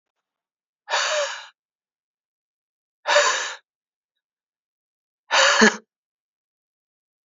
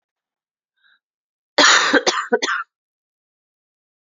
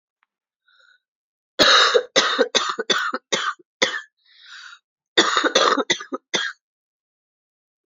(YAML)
exhalation_length: 7.3 s
exhalation_amplitude: 27309
exhalation_signal_mean_std_ratio: 0.31
cough_length: 4.0 s
cough_amplitude: 31424
cough_signal_mean_std_ratio: 0.34
three_cough_length: 7.9 s
three_cough_amplitude: 31093
three_cough_signal_mean_std_ratio: 0.43
survey_phase: beta (2021-08-13 to 2022-03-07)
age: 18-44
gender: Female
wearing_mask: 'No'
symptom_cough_any: true
symptom_runny_or_blocked_nose: true
symptom_sore_throat: true
symptom_headache: true
symptom_change_to_sense_of_smell_or_taste: true
symptom_onset: 4 days
smoker_status: Never smoked
respiratory_condition_asthma: false
respiratory_condition_other: false
recruitment_source: Test and Trace
submission_delay: 2 days
covid_test_result: Positive
covid_test_method: RT-qPCR
covid_ct_value: 14.1
covid_ct_gene: ORF1ab gene
covid_ct_mean: 14.7
covid_viral_load: 15000000 copies/ml
covid_viral_load_category: High viral load (>1M copies/ml)